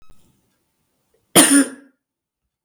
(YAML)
cough_length: 2.6 s
cough_amplitude: 32768
cough_signal_mean_std_ratio: 0.28
survey_phase: beta (2021-08-13 to 2022-03-07)
age: 45-64
gender: Female
wearing_mask: 'No'
symptom_cough_any: true
symptom_sore_throat: true
symptom_onset: 7 days
smoker_status: Never smoked
respiratory_condition_asthma: false
respiratory_condition_other: false
recruitment_source: Test and Trace
submission_delay: 1 day
covid_test_result: Positive
covid_test_method: RT-qPCR
covid_ct_value: 29.1
covid_ct_gene: ORF1ab gene